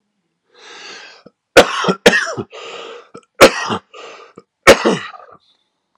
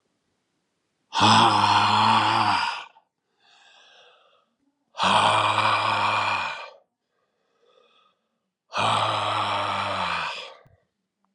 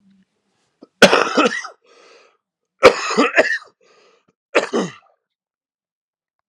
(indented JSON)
{
  "three_cough_length": "6.0 s",
  "three_cough_amplitude": 32768,
  "three_cough_signal_mean_std_ratio": 0.33,
  "exhalation_length": "11.3 s",
  "exhalation_amplitude": 19391,
  "exhalation_signal_mean_std_ratio": 0.56,
  "cough_length": "6.5 s",
  "cough_amplitude": 32768,
  "cough_signal_mean_std_ratio": 0.32,
  "survey_phase": "beta (2021-08-13 to 2022-03-07)",
  "age": "45-64",
  "gender": "Male",
  "wearing_mask": "No",
  "symptom_cough_any": true,
  "symptom_runny_or_blocked_nose": true,
  "symptom_sore_throat": true,
  "symptom_headache": true,
  "symptom_onset": "4 days",
  "smoker_status": "Never smoked",
  "respiratory_condition_asthma": false,
  "respiratory_condition_other": false,
  "recruitment_source": "Test and Trace",
  "submission_delay": "1 day",
  "covid_test_result": "Positive",
  "covid_test_method": "RT-qPCR",
  "covid_ct_value": 17.4,
  "covid_ct_gene": "ORF1ab gene",
  "covid_ct_mean": 18.4,
  "covid_viral_load": "950000 copies/ml",
  "covid_viral_load_category": "Low viral load (10K-1M copies/ml)"
}